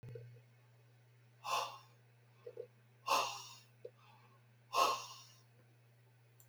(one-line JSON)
{"exhalation_length": "6.5 s", "exhalation_amplitude": 3642, "exhalation_signal_mean_std_ratio": 0.37, "survey_phase": "beta (2021-08-13 to 2022-03-07)", "age": "65+", "gender": "Male", "wearing_mask": "No", "symptom_none": true, "smoker_status": "Never smoked", "respiratory_condition_asthma": false, "respiratory_condition_other": false, "recruitment_source": "REACT", "submission_delay": "1 day", "covid_test_result": "Negative", "covid_test_method": "RT-qPCR", "influenza_a_test_result": "Negative", "influenza_b_test_result": "Negative"}